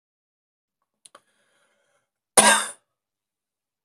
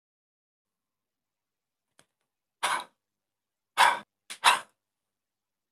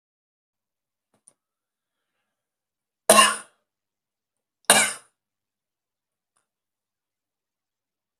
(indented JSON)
{
  "cough_length": "3.8 s",
  "cough_amplitude": 32768,
  "cough_signal_mean_std_ratio": 0.2,
  "exhalation_length": "5.7 s",
  "exhalation_amplitude": 20304,
  "exhalation_signal_mean_std_ratio": 0.22,
  "three_cough_length": "8.2 s",
  "three_cough_amplitude": 32768,
  "three_cough_signal_mean_std_ratio": 0.17,
  "survey_phase": "beta (2021-08-13 to 2022-03-07)",
  "age": "45-64",
  "gender": "Male",
  "wearing_mask": "No",
  "symptom_runny_or_blocked_nose": true,
  "symptom_diarrhoea": true,
  "symptom_other": true,
  "smoker_status": "Never smoked",
  "respiratory_condition_asthma": true,
  "respiratory_condition_other": false,
  "recruitment_source": "Test and Trace",
  "submission_delay": "0 days",
  "covid_test_result": "Negative",
  "covid_test_method": "RT-qPCR"
}